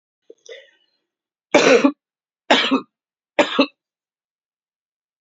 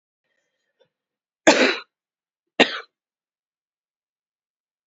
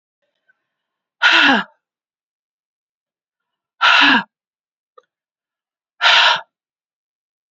{
  "three_cough_length": "5.2 s",
  "three_cough_amplitude": 28541,
  "three_cough_signal_mean_std_ratio": 0.31,
  "cough_length": "4.9 s",
  "cough_amplitude": 32033,
  "cough_signal_mean_std_ratio": 0.21,
  "exhalation_length": "7.5 s",
  "exhalation_amplitude": 32385,
  "exhalation_signal_mean_std_ratio": 0.32,
  "survey_phase": "beta (2021-08-13 to 2022-03-07)",
  "age": "45-64",
  "gender": "Female",
  "wearing_mask": "No",
  "symptom_new_continuous_cough": true,
  "symptom_runny_or_blocked_nose": true,
  "symptom_shortness_of_breath": true,
  "symptom_sore_throat": true,
  "symptom_fatigue": true,
  "symptom_fever_high_temperature": true,
  "symptom_headache": true,
  "symptom_change_to_sense_of_smell_or_taste": true,
  "symptom_loss_of_taste": true,
  "symptom_onset": "4 days",
  "smoker_status": "Current smoker (11 or more cigarettes per day)",
  "respiratory_condition_asthma": true,
  "respiratory_condition_other": false,
  "recruitment_source": "Test and Trace",
  "submission_delay": "2 days",
  "covid_test_result": "Positive",
  "covid_test_method": "RT-qPCR"
}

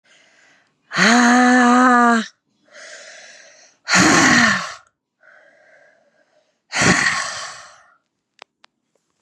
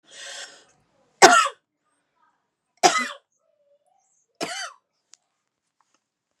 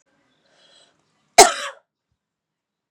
{
  "exhalation_length": "9.2 s",
  "exhalation_amplitude": 31399,
  "exhalation_signal_mean_std_ratio": 0.45,
  "three_cough_length": "6.4 s",
  "three_cough_amplitude": 32768,
  "three_cough_signal_mean_std_ratio": 0.22,
  "cough_length": "2.9 s",
  "cough_amplitude": 32768,
  "cough_signal_mean_std_ratio": 0.17,
  "survey_phase": "beta (2021-08-13 to 2022-03-07)",
  "age": "18-44",
  "gender": "Female",
  "wearing_mask": "Yes",
  "symptom_runny_or_blocked_nose": true,
  "symptom_sore_throat": true,
  "symptom_headache": true,
  "symptom_onset": "3 days",
  "smoker_status": "Never smoked",
  "respiratory_condition_asthma": false,
  "respiratory_condition_other": false,
  "recruitment_source": "Test and Trace",
  "submission_delay": "2 days",
  "covid_test_result": "Positive",
  "covid_test_method": "LAMP"
}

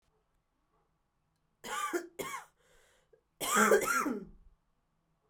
{
  "cough_length": "5.3 s",
  "cough_amplitude": 7283,
  "cough_signal_mean_std_ratio": 0.37,
  "survey_phase": "alpha (2021-03-01 to 2021-08-12)",
  "age": "18-44",
  "gender": "Female",
  "wearing_mask": "No",
  "symptom_cough_any": true,
  "symptom_diarrhoea": true,
  "symptom_fatigue": true,
  "symptom_fever_high_temperature": true,
  "symptom_headache": true,
  "symptom_change_to_sense_of_smell_or_taste": true,
  "symptom_loss_of_taste": true,
  "symptom_onset": "4 days",
  "smoker_status": "Never smoked",
  "respiratory_condition_asthma": false,
  "respiratory_condition_other": false,
  "recruitment_source": "Test and Trace",
  "submission_delay": "1 day",
  "covid_test_result": "Positive",
  "covid_test_method": "RT-qPCR",
  "covid_ct_value": 16.9,
  "covid_ct_gene": "ORF1ab gene",
  "covid_ct_mean": 17.5,
  "covid_viral_load": "1800000 copies/ml",
  "covid_viral_load_category": "High viral load (>1M copies/ml)"
}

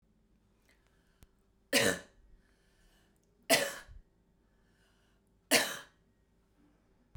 {
  "three_cough_length": "7.2 s",
  "three_cough_amplitude": 9564,
  "three_cough_signal_mean_std_ratio": 0.25,
  "survey_phase": "beta (2021-08-13 to 2022-03-07)",
  "age": "18-44",
  "gender": "Female",
  "wearing_mask": "No",
  "symptom_cough_any": true,
  "symptom_sore_throat": true,
  "symptom_onset": "12 days",
  "smoker_status": "Never smoked",
  "respiratory_condition_asthma": false,
  "respiratory_condition_other": false,
  "recruitment_source": "REACT",
  "submission_delay": "1 day",
  "covid_test_result": "Negative",
  "covid_test_method": "RT-qPCR"
}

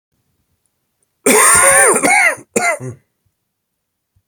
{
  "cough_length": "4.3 s",
  "cough_amplitude": 32768,
  "cough_signal_mean_std_ratio": 0.48,
  "survey_phase": "beta (2021-08-13 to 2022-03-07)",
  "age": "45-64",
  "gender": "Male",
  "wearing_mask": "No",
  "symptom_cough_any": true,
  "symptom_new_continuous_cough": true,
  "symptom_runny_or_blocked_nose": true,
  "symptom_sore_throat": true,
  "symptom_fatigue": true,
  "symptom_fever_high_temperature": true,
  "symptom_onset": "2 days",
  "smoker_status": "Never smoked",
  "respiratory_condition_asthma": false,
  "respiratory_condition_other": false,
  "recruitment_source": "Test and Trace",
  "submission_delay": "1 day",
  "covid_test_result": "Positive",
  "covid_test_method": "RT-qPCR",
  "covid_ct_value": 15.4,
  "covid_ct_gene": "ORF1ab gene",
  "covid_ct_mean": 15.5,
  "covid_viral_load": "8100000 copies/ml",
  "covid_viral_load_category": "High viral load (>1M copies/ml)"
}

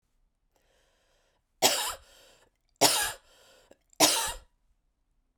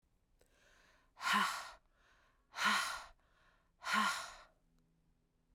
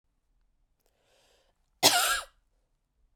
{
  "three_cough_length": "5.4 s",
  "three_cough_amplitude": 18911,
  "three_cough_signal_mean_std_ratio": 0.31,
  "exhalation_length": "5.5 s",
  "exhalation_amplitude": 3124,
  "exhalation_signal_mean_std_ratio": 0.4,
  "cough_length": "3.2 s",
  "cough_amplitude": 20813,
  "cough_signal_mean_std_ratio": 0.26,
  "survey_phase": "beta (2021-08-13 to 2022-03-07)",
  "age": "18-44",
  "gender": "Female",
  "wearing_mask": "No",
  "symptom_cough_any": true,
  "symptom_new_continuous_cough": true,
  "symptom_runny_or_blocked_nose": true,
  "symptom_sore_throat": true,
  "symptom_headache": true,
  "smoker_status": "Never smoked",
  "respiratory_condition_asthma": false,
  "respiratory_condition_other": false,
  "recruitment_source": "Test and Trace",
  "submission_delay": "2 days",
  "covid_test_result": "Positive",
  "covid_test_method": "RT-qPCR",
  "covid_ct_value": 25.9,
  "covid_ct_gene": "N gene",
  "covid_ct_mean": 26.1,
  "covid_viral_load": "2800 copies/ml",
  "covid_viral_load_category": "Minimal viral load (< 10K copies/ml)"
}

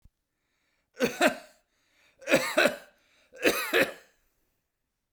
{
  "three_cough_length": "5.1 s",
  "three_cough_amplitude": 15014,
  "three_cough_signal_mean_std_ratio": 0.35,
  "survey_phase": "beta (2021-08-13 to 2022-03-07)",
  "age": "45-64",
  "gender": "Male",
  "wearing_mask": "No",
  "symptom_none": true,
  "smoker_status": "Never smoked",
  "respiratory_condition_asthma": false,
  "respiratory_condition_other": false,
  "recruitment_source": "REACT",
  "submission_delay": "2 days",
  "covid_test_result": "Negative",
  "covid_test_method": "RT-qPCR"
}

